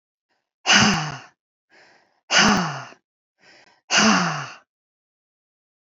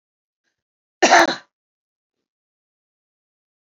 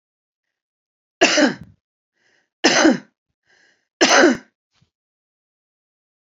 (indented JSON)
{
  "exhalation_length": "5.9 s",
  "exhalation_amplitude": 27115,
  "exhalation_signal_mean_std_ratio": 0.39,
  "cough_length": "3.7 s",
  "cough_amplitude": 30467,
  "cough_signal_mean_std_ratio": 0.21,
  "three_cough_length": "6.3 s",
  "three_cough_amplitude": 29749,
  "three_cough_signal_mean_std_ratio": 0.32,
  "survey_phase": "beta (2021-08-13 to 2022-03-07)",
  "age": "45-64",
  "gender": "Female",
  "wearing_mask": "No",
  "symptom_cough_any": true,
  "smoker_status": "Ex-smoker",
  "respiratory_condition_asthma": false,
  "respiratory_condition_other": false,
  "recruitment_source": "REACT",
  "submission_delay": "1 day",
  "covid_test_result": "Negative",
  "covid_test_method": "RT-qPCR",
  "influenza_a_test_result": "Negative",
  "influenza_b_test_result": "Negative"
}